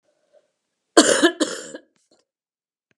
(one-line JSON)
{"cough_length": "3.0 s", "cough_amplitude": 32767, "cough_signal_mean_std_ratio": 0.29, "survey_phase": "alpha (2021-03-01 to 2021-08-12)", "age": "65+", "gender": "Female", "wearing_mask": "No", "symptom_headache": true, "symptom_onset": "8 days", "smoker_status": "Never smoked", "respiratory_condition_asthma": false, "respiratory_condition_other": false, "recruitment_source": "REACT", "submission_delay": "1 day", "covid_test_result": "Negative", "covid_test_method": "RT-qPCR"}